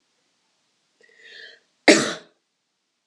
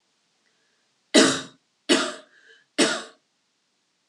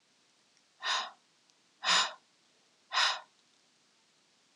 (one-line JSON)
{"cough_length": "3.1 s", "cough_amplitude": 32514, "cough_signal_mean_std_ratio": 0.2, "three_cough_length": "4.1 s", "three_cough_amplitude": 24857, "three_cough_signal_mean_std_ratio": 0.31, "exhalation_length": "4.6 s", "exhalation_amplitude": 7697, "exhalation_signal_mean_std_ratio": 0.33, "survey_phase": "beta (2021-08-13 to 2022-03-07)", "age": "18-44", "gender": "Female", "wearing_mask": "No", "symptom_none": true, "smoker_status": "Never smoked", "respiratory_condition_asthma": false, "respiratory_condition_other": false, "recruitment_source": "REACT", "submission_delay": "1 day", "covid_test_result": "Negative", "covid_test_method": "RT-qPCR"}